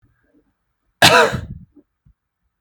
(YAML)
cough_length: 2.6 s
cough_amplitude: 32768
cough_signal_mean_std_ratio: 0.29
survey_phase: beta (2021-08-13 to 2022-03-07)
age: 18-44
gender: Male
wearing_mask: 'No'
symptom_none: true
smoker_status: Never smoked
respiratory_condition_asthma: false
respiratory_condition_other: false
recruitment_source: REACT
submission_delay: 1 day
covid_test_result: Negative
covid_test_method: RT-qPCR
influenza_a_test_result: Negative
influenza_b_test_result: Negative